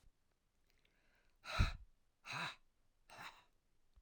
{"exhalation_length": "4.0 s", "exhalation_amplitude": 2785, "exhalation_signal_mean_std_ratio": 0.29, "survey_phase": "alpha (2021-03-01 to 2021-08-12)", "age": "65+", "gender": "Female", "wearing_mask": "No", "symptom_none": true, "symptom_onset": "12 days", "smoker_status": "Never smoked", "respiratory_condition_asthma": false, "respiratory_condition_other": false, "recruitment_source": "REACT", "submission_delay": "1 day", "covid_test_result": "Negative", "covid_test_method": "RT-qPCR"}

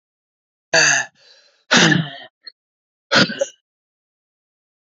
{"exhalation_length": "4.9 s", "exhalation_amplitude": 31366, "exhalation_signal_mean_std_ratio": 0.35, "survey_phase": "alpha (2021-03-01 to 2021-08-12)", "age": "45-64", "gender": "Male", "wearing_mask": "No", "symptom_cough_any": true, "symptom_new_continuous_cough": true, "symptom_shortness_of_breath": true, "symptom_fatigue": true, "symptom_fever_high_temperature": true, "symptom_headache": true, "symptom_onset": "3 days", "smoker_status": "Ex-smoker", "respiratory_condition_asthma": false, "respiratory_condition_other": false, "recruitment_source": "Test and Trace", "submission_delay": "1 day", "covid_test_result": "Positive", "covid_test_method": "RT-qPCR", "covid_ct_value": 15.8, "covid_ct_gene": "N gene", "covid_ct_mean": 16.0, "covid_viral_load": "5500000 copies/ml", "covid_viral_load_category": "High viral load (>1M copies/ml)"}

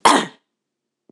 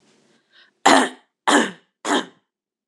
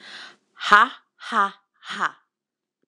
{"cough_length": "1.1 s", "cough_amplitude": 26028, "cough_signal_mean_std_ratio": 0.32, "three_cough_length": "2.9 s", "three_cough_amplitude": 26028, "three_cough_signal_mean_std_ratio": 0.35, "exhalation_length": "2.9 s", "exhalation_amplitude": 26028, "exhalation_signal_mean_std_ratio": 0.3, "survey_phase": "beta (2021-08-13 to 2022-03-07)", "age": "18-44", "gender": "Female", "wearing_mask": "No", "symptom_runny_or_blocked_nose": true, "symptom_change_to_sense_of_smell_or_taste": true, "smoker_status": "Never smoked", "respiratory_condition_asthma": false, "respiratory_condition_other": false, "recruitment_source": "Test and Trace", "submission_delay": "2 days", "covid_test_result": "Positive", "covid_test_method": "LAMP"}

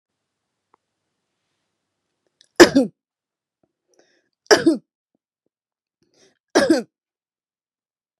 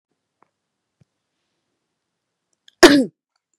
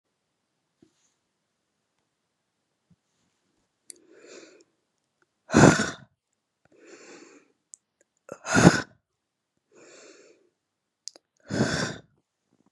{"three_cough_length": "8.2 s", "three_cough_amplitude": 32768, "three_cough_signal_mean_std_ratio": 0.2, "cough_length": "3.6 s", "cough_amplitude": 32768, "cough_signal_mean_std_ratio": 0.18, "exhalation_length": "12.7 s", "exhalation_amplitude": 32768, "exhalation_signal_mean_std_ratio": 0.2, "survey_phase": "beta (2021-08-13 to 2022-03-07)", "age": "45-64", "gender": "Female", "wearing_mask": "No", "symptom_none": true, "smoker_status": "Never smoked", "respiratory_condition_asthma": false, "respiratory_condition_other": false, "recruitment_source": "REACT", "submission_delay": "4 days", "covid_test_result": "Negative", "covid_test_method": "RT-qPCR", "influenza_a_test_result": "Unknown/Void", "influenza_b_test_result": "Unknown/Void"}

